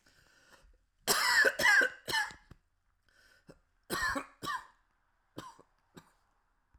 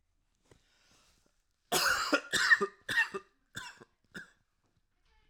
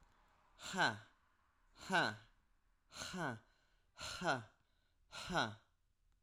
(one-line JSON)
{"three_cough_length": "6.8 s", "three_cough_amplitude": 6724, "three_cough_signal_mean_std_ratio": 0.37, "cough_length": "5.3 s", "cough_amplitude": 8154, "cough_signal_mean_std_ratio": 0.35, "exhalation_length": "6.2 s", "exhalation_amplitude": 2395, "exhalation_signal_mean_std_ratio": 0.39, "survey_phase": "alpha (2021-03-01 to 2021-08-12)", "age": "18-44", "gender": "Male", "wearing_mask": "No", "symptom_cough_any": true, "symptom_onset": "8 days", "smoker_status": "Never smoked", "respiratory_condition_asthma": false, "respiratory_condition_other": false, "recruitment_source": "REACT", "submission_delay": "2 days", "covid_test_result": "Negative", "covid_test_method": "RT-qPCR"}